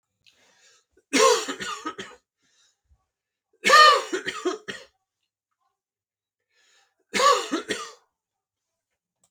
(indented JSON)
{
  "three_cough_length": "9.3 s",
  "three_cough_amplitude": 26594,
  "three_cough_signal_mean_std_ratio": 0.31,
  "survey_phase": "beta (2021-08-13 to 2022-03-07)",
  "age": "18-44",
  "gender": "Male",
  "wearing_mask": "No",
  "symptom_none": true,
  "smoker_status": "Ex-smoker",
  "respiratory_condition_asthma": false,
  "respiratory_condition_other": false,
  "recruitment_source": "REACT",
  "submission_delay": "8 days",
  "covid_test_method": "RT-qPCR"
}